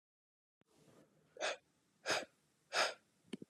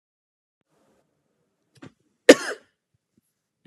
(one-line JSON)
{"exhalation_length": "3.5 s", "exhalation_amplitude": 2779, "exhalation_signal_mean_std_ratio": 0.33, "cough_length": "3.7 s", "cough_amplitude": 32768, "cough_signal_mean_std_ratio": 0.11, "survey_phase": "alpha (2021-03-01 to 2021-08-12)", "age": "18-44", "gender": "Male", "wearing_mask": "No", "symptom_cough_any": true, "symptom_new_continuous_cough": true, "symptom_abdominal_pain": true, "symptom_fatigue": true, "symptom_headache": true, "symptom_onset": "2 days", "smoker_status": "Never smoked", "respiratory_condition_asthma": false, "respiratory_condition_other": false, "recruitment_source": "Test and Trace", "submission_delay": "2 days", "covid_test_result": "Positive", "covid_test_method": "RT-qPCR", "covid_ct_value": 21.7, "covid_ct_gene": "ORF1ab gene", "covid_ct_mean": 22.9, "covid_viral_load": "30000 copies/ml", "covid_viral_load_category": "Low viral load (10K-1M copies/ml)"}